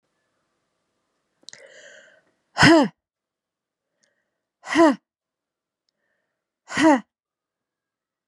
{"exhalation_length": "8.3 s", "exhalation_amplitude": 28440, "exhalation_signal_mean_std_ratio": 0.24, "survey_phase": "beta (2021-08-13 to 2022-03-07)", "age": "45-64", "gender": "Female", "wearing_mask": "No", "symptom_runny_or_blocked_nose": true, "symptom_diarrhoea": true, "symptom_fatigue": true, "smoker_status": "Never smoked", "respiratory_condition_asthma": false, "respiratory_condition_other": false, "recruitment_source": "Test and Trace", "submission_delay": "2 days", "covid_test_result": "Positive", "covid_test_method": "LFT"}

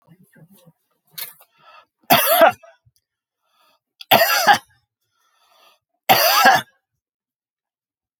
{"three_cough_length": "8.2 s", "three_cough_amplitude": 32768, "three_cough_signal_mean_std_ratio": 0.33, "survey_phase": "alpha (2021-03-01 to 2021-08-12)", "age": "65+", "gender": "Male", "wearing_mask": "No", "symptom_none": true, "smoker_status": "Never smoked", "respiratory_condition_asthma": false, "respiratory_condition_other": false, "recruitment_source": "REACT", "submission_delay": "2 days", "covid_test_result": "Negative", "covid_test_method": "RT-qPCR"}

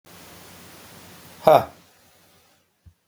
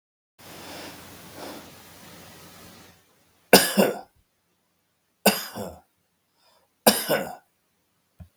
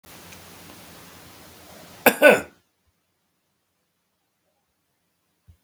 {"exhalation_length": "3.1 s", "exhalation_amplitude": 32768, "exhalation_signal_mean_std_ratio": 0.22, "three_cough_length": "8.4 s", "three_cough_amplitude": 32768, "three_cough_signal_mean_std_ratio": 0.27, "cough_length": "5.6 s", "cough_amplitude": 32768, "cough_signal_mean_std_ratio": 0.19, "survey_phase": "beta (2021-08-13 to 2022-03-07)", "age": "45-64", "gender": "Male", "wearing_mask": "No", "symptom_abdominal_pain": true, "symptom_fatigue": true, "symptom_onset": "10 days", "smoker_status": "Never smoked", "respiratory_condition_asthma": false, "respiratory_condition_other": false, "recruitment_source": "REACT", "submission_delay": "8 days", "covid_test_result": "Negative", "covid_test_method": "RT-qPCR", "influenza_a_test_result": "Negative", "influenza_b_test_result": "Negative"}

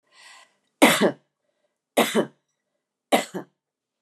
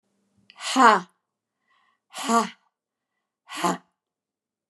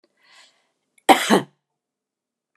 {"three_cough_length": "4.0 s", "three_cough_amplitude": 32526, "three_cough_signal_mean_std_ratio": 0.3, "exhalation_length": "4.7 s", "exhalation_amplitude": 28650, "exhalation_signal_mean_std_ratio": 0.28, "cough_length": "2.6 s", "cough_amplitude": 32662, "cough_signal_mean_std_ratio": 0.23, "survey_phase": "beta (2021-08-13 to 2022-03-07)", "age": "65+", "gender": "Female", "wearing_mask": "No", "symptom_runny_or_blocked_nose": true, "symptom_fatigue": true, "smoker_status": "Never smoked", "respiratory_condition_asthma": false, "respiratory_condition_other": false, "recruitment_source": "REACT", "submission_delay": "1 day", "covid_test_result": "Negative", "covid_test_method": "RT-qPCR"}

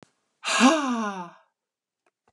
{"exhalation_length": "2.3 s", "exhalation_amplitude": 18125, "exhalation_signal_mean_std_ratio": 0.42, "survey_phase": "beta (2021-08-13 to 2022-03-07)", "age": "65+", "gender": "Female", "wearing_mask": "No", "symptom_none": true, "smoker_status": "Never smoked", "respiratory_condition_asthma": false, "respiratory_condition_other": false, "recruitment_source": "REACT", "submission_delay": "2 days", "covid_test_result": "Negative", "covid_test_method": "RT-qPCR", "influenza_a_test_result": "Negative", "influenza_b_test_result": "Negative"}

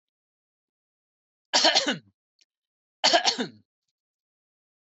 {"three_cough_length": "4.9 s", "three_cough_amplitude": 16210, "three_cough_signal_mean_std_ratio": 0.29, "survey_phase": "beta (2021-08-13 to 2022-03-07)", "age": "45-64", "gender": "Male", "wearing_mask": "No", "symptom_none": true, "smoker_status": "Never smoked", "respiratory_condition_asthma": false, "respiratory_condition_other": false, "recruitment_source": "REACT", "submission_delay": "3 days", "covid_test_result": "Negative", "covid_test_method": "RT-qPCR", "covid_ct_value": 43.0, "covid_ct_gene": "N gene"}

